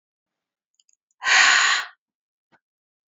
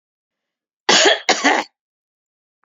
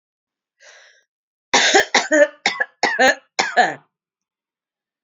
{"exhalation_length": "3.1 s", "exhalation_amplitude": 22663, "exhalation_signal_mean_std_ratio": 0.35, "cough_length": "2.6 s", "cough_amplitude": 30892, "cough_signal_mean_std_ratio": 0.37, "three_cough_length": "5.0 s", "three_cough_amplitude": 29766, "three_cough_signal_mean_std_ratio": 0.4, "survey_phase": "beta (2021-08-13 to 2022-03-07)", "age": "45-64", "gender": "Female", "wearing_mask": "No", "symptom_cough_any": true, "symptom_runny_or_blocked_nose": true, "symptom_shortness_of_breath": true, "symptom_sore_throat": true, "symptom_abdominal_pain": true, "symptom_diarrhoea": true, "symptom_fatigue": true, "symptom_headache": true, "symptom_change_to_sense_of_smell_or_taste": true, "symptom_other": true, "symptom_onset": "4 days", "smoker_status": "Never smoked", "respiratory_condition_asthma": true, "respiratory_condition_other": false, "recruitment_source": "Test and Trace", "submission_delay": "1 day", "covid_test_result": "Positive", "covid_test_method": "RT-qPCR", "covid_ct_value": 18.2, "covid_ct_gene": "N gene"}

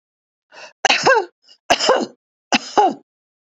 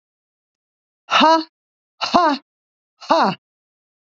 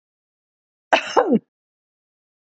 {"three_cough_length": "3.6 s", "three_cough_amplitude": 32768, "three_cough_signal_mean_std_ratio": 0.4, "exhalation_length": "4.2 s", "exhalation_amplitude": 27497, "exhalation_signal_mean_std_ratio": 0.36, "cough_length": "2.6 s", "cough_amplitude": 29670, "cough_signal_mean_std_ratio": 0.27, "survey_phase": "beta (2021-08-13 to 2022-03-07)", "age": "65+", "gender": "Female", "wearing_mask": "No", "symptom_none": true, "smoker_status": "Ex-smoker", "respiratory_condition_asthma": false, "respiratory_condition_other": false, "recruitment_source": "REACT", "submission_delay": "1 day", "covid_test_result": "Negative", "covid_test_method": "RT-qPCR", "influenza_a_test_result": "Negative", "influenza_b_test_result": "Negative"}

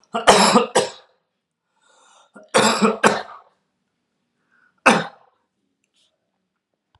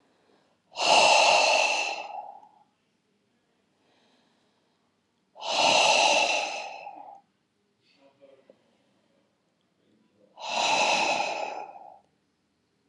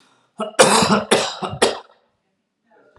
{"three_cough_length": "7.0 s", "three_cough_amplitude": 32768, "three_cough_signal_mean_std_ratio": 0.33, "exhalation_length": "12.9 s", "exhalation_amplitude": 13788, "exhalation_signal_mean_std_ratio": 0.44, "cough_length": "3.0 s", "cough_amplitude": 32768, "cough_signal_mean_std_ratio": 0.44, "survey_phase": "alpha (2021-03-01 to 2021-08-12)", "age": "45-64", "gender": "Male", "wearing_mask": "No", "symptom_none": true, "smoker_status": "Never smoked", "respiratory_condition_asthma": false, "respiratory_condition_other": false, "recruitment_source": "REACT", "submission_delay": "1 day", "covid_test_result": "Negative", "covid_test_method": "RT-qPCR"}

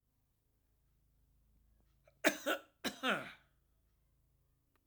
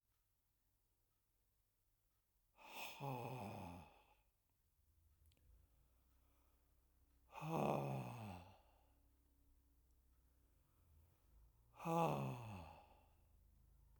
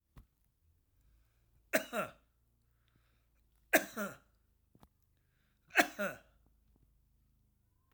{"cough_length": "4.9 s", "cough_amplitude": 6344, "cough_signal_mean_std_ratio": 0.26, "exhalation_length": "14.0 s", "exhalation_amplitude": 1754, "exhalation_signal_mean_std_ratio": 0.36, "three_cough_length": "7.9 s", "three_cough_amplitude": 9112, "three_cough_signal_mean_std_ratio": 0.22, "survey_phase": "alpha (2021-03-01 to 2021-08-12)", "age": "45-64", "gender": "Male", "wearing_mask": "No", "symptom_none": true, "smoker_status": "Never smoked", "respiratory_condition_asthma": true, "respiratory_condition_other": false, "recruitment_source": "REACT", "submission_delay": "2 days", "covid_test_result": "Negative", "covid_test_method": "RT-qPCR"}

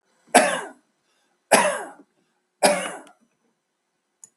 {"three_cough_length": "4.4 s", "three_cough_amplitude": 32768, "three_cough_signal_mean_std_ratio": 0.32, "survey_phase": "beta (2021-08-13 to 2022-03-07)", "age": "65+", "gender": "Male", "wearing_mask": "No", "symptom_runny_or_blocked_nose": true, "smoker_status": "Ex-smoker", "respiratory_condition_asthma": false, "respiratory_condition_other": false, "recruitment_source": "REACT", "submission_delay": "2 days", "covid_test_result": "Negative", "covid_test_method": "RT-qPCR", "influenza_a_test_result": "Negative", "influenza_b_test_result": "Negative"}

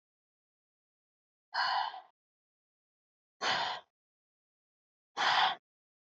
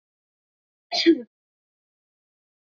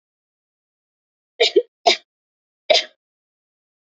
{"exhalation_length": "6.1 s", "exhalation_amplitude": 4764, "exhalation_signal_mean_std_ratio": 0.34, "cough_length": "2.7 s", "cough_amplitude": 14946, "cough_signal_mean_std_ratio": 0.22, "three_cough_length": "3.9 s", "three_cough_amplitude": 27155, "three_cough_signal_mean_std_ratio": 0.23, "survey_phase": "beta (2021-08-13 to 2022-03-07)", "age": "18-44", "gender": "Female", "wearing_mask": "No", "symptom_none": true, "smoker_status": "Ex-smoker", "respiratory_condition_asthma": false, "respiratory_condition_other": false, "recruitment_source": "REACT", "submission_delay": "2 days", "covid_test_result": "Negative", "covid_test_method": "RT-qPCR", "influenza_a_test_result": "Negative", "influenza_b_test_result": "Negative"}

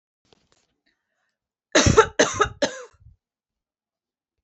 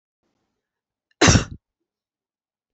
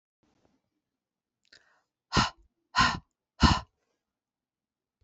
{"three_cough_length": "4.4 s", "three_cough_amplitude": 26672, "three_cough_signal_mean_std_ratio": 0.27, "cough_length": "2.7 s", "cough_amplitude": 26953, "cough_signal_mean_std_ratio": 0.22, "exhalation_length": "5.0 s", "exhalation_amplitude": 17646, "exhalation_signal_mean_std_ratio": 0.24, "survey_phase": "beta (2021-08-13 to 2022-03-07)", "age": "45-64", "gender": "Female", "wearing_mask": "No", "symptom_none": true, "smoker_status": "Never smoked", "respiratory_condition_asthma": false, "respiratory_condition_other": false, "recruitment_source": "REACT", "submission_delay": "2 days", "covid_test_result": "Negative", "covid_test_method": "RT-qPCR"}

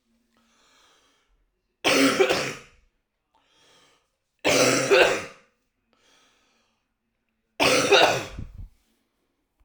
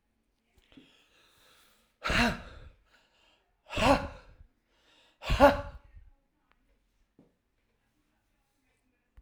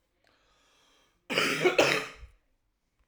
{"three_cough_length": "9.6 s", "three_cough_amplitude": 24557, "three_cough_signal_mean_std_ratio": 0.38, "exhalation_length": "9.2 s", "exhalation_amplitude": 16256, "exhalation_signal_mean_std_ratio": 0.25, "cough_length": "3.1 s", "cough_amplitude": 14365, "cough_signal_mean_std_ratio": 0.38, "survey_phase": "alpha (2021-03-01 to 2021-08-12)", "age": "18-44", "gender": "Female", "wearing_mask": "No", "symptom_cough_any": true, "symptom_diarrhoea": true, "symptom_fatigue": true, "symptom_headache": true, "smoker_status": "Ex-smoker", "respiratory_condition_asthma": false, "respiratory_condition_other": false, "recruitment_source": "Test and Trace", "submission_delay": "2 days", "covid_test_result": "Positive", "covid_test_method": "RT-qPCR"}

